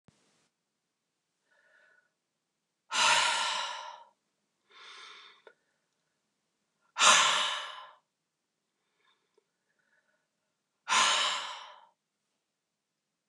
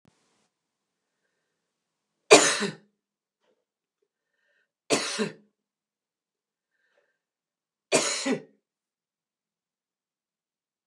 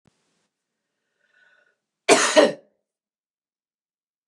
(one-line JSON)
{"exhalation_length": "13.3 s", "exhalation_amplitude": 12568, "exhalation_signal_mean_std_ratio": 0.31, "three_cough_length": "10.9 s", "three_cough_amplitude": 28829, "three_cough_signal_mean_std_ratio": 0.2, "cough_length": "4.3 s", "cough_amplitude": 28883, "cough_signal_mean_std_ratio": 0.23, "survey_phase": "beta (2021-08-13 to 2022-03-07)", "age": "45-64", "gender": "Female", "wearing_mask": "No", "symptom_runny_or_blocked_nose": true, "smoker_status": "Never smoked", "respiratory_condition_asthma": false, "respiratory_condition_other": false, "recruitment_source": "REACT", "submission_delay": "3 days", "covid_test_result": "Negative", "covid_test_method": "RT-qPCR", "influenza_a_test_result": "Unknown/Void", "influenza_b_test_result": "Unknown/Void"}